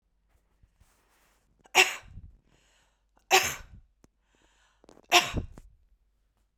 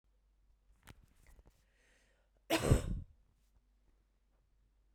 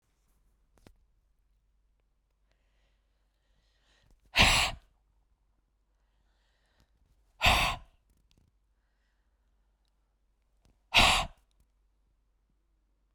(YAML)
three_cough_length: 6.6 s
three_cough_amplitude: 22212
three_cough_signal_mean_std_ratio: 0.23
cough_length: 4.9 s
cough_amplitude: 5149
cough_signal_mean_std_ratio: 0.24
exhalation_length: 13.1 s
exhalation_amplitude: 14774
exhalation_signal_mean_std_ratio: 0.22
survey_phase: beta (2021-08-13 to 2022-03-07)
age: 45-64
gender: Female
wearing_mask: 'No'
symptom_none: true
smoker_status: Ex-smoker
respiratory_condition_asthma: false
respiratory_condition_other: false
recruitment_source: REACT
submission_delay: 1 day
covid_test_result: Negative
covid_test_method: RT-qPCR